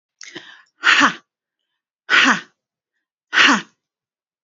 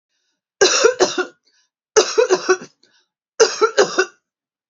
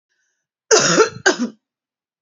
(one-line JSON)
{"exhalation_length": "4.4 s", "exhalation_amplitude": 29350, "exhalation_signal_mean_std_ratio": 0.35, "three_cough_length": "4.7 s", "three_cough_amplitude": 32768, "three_cough_signal_mean_std_ratio": 0.43, "cough_length": "2.2 s", "cough_amplitude": 31345, "cough_signal_mean_std_ratio": 0.4, "survey_phase": "beta (2021-08-13 to 2022-03-07)", "age": "45-64", "gender": "Female", "wearing_mask": "No", "symptom_runny_or_blocked_nose": true, "symptom_fatigue": true, "symptom_onset": "5 days", "smoker_status": "Never smoked", "respiratory_condition_asthma": true, "respiratory_condition_other": false, "recruitment_source": "REACT", "submission_delay": "2 days", "covid_test_result": "Negative", "covid_test_method": "RT-qPCR", "influenza_a_test_result": "Negative", "influenza_b_test_result": "Negative"}